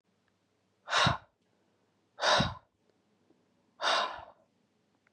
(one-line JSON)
{"exhalation_length": "5.1 s", "exhalation_amplitude": 6978, "exhalation_signal_mean_std_ratio": 0.34, "survey_phase": "beta (2021-08-13 to 2022-03-07)", "age": "18-44", "gender": "Male", "wearing_mask": "No", "symptom_cough_any": true, "symptom_new_continuous_cough": true, "symptom_runny_or_blocked_nose": true, "symptom_shortness_of_breath": true, "symptom_sore_throat": true, "symptom_fatigue": true, "symptom_fever_high_temperature": true, "symptom_headache": true, "symptom_change_to_sense_of_smell_or_taste": true, "symptom_loss_of_taste": true, "symptom_other": true, "symptom_onset": "3 days", "smoker_status": "Never smoked", "respiratory_condition_asthma": false, "respiratory_condition_other": false, "recruitment_source": "Test and Trace", "submission_delay": "2 days", "covid_test_result": "Positive", "covid_test_method": "RT-qPCR", "covid_ct_value": 15.6, "covid_ct_gene": "ORF1ab gene"}